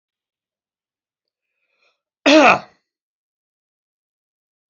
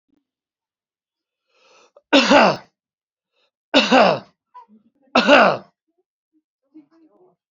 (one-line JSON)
{"cough_length": "4.7 s", "cough_amplitude": 29844, "cough_signal_mean_std_ratio": 0.21, "three_cough_length": "7.5 s", "three_cough_amplitude": 32767, "three_cough_signal_mean_std_ratio": 0.32, "survey_phase": "beta (2021-08-13 to 2022-03-07)", "age": "45-64", "gender": "Male", "wearing_mask": "No", "symptom_none": true, "smoker_status": "Ex-smoker", "respiratory_condition_asthma": false, "respiratory_condition_other": false, "recruitment_source": "REACT", "submission_delay": "1 day", "covid_test_result": "Negative", "covid_test_method": "RT-qPCR"}